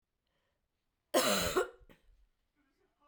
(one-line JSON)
{"cough_length": "3.1 s", "cough_amplitude": 5352, "cough_signal_mean_std_ratio": 0.34, "survey_phase": "beta (2021-08-13 to 2022-03-07)", "age": "45-64", "gender": "Female", "wearing_mask": "No", "symptom_new_continuous_cough": true, "symptom_runny_or_blocked_nose": true, "symptom_shortness_of_breath": true, "symptom_fatigue": true, "symptom_headache": true, "smoker_status": "Never smoked", "respiratory_condition_asthma": false, "respiratory_condition_other": false, "recruitment_source": "Test and Trace", "submission_delay": "1 day", "covid_test_result": "Positive", "covid_test_method": "RT-qPCR", "covid_ct_value": 20.0, "covid_ct_gene": "S gene", "covid_ct_mean": 20.8, "covid_viral_load": "150000 copies/ml", "covid_viral_load_category": "Low viral load (10K-1M copies/ml)"}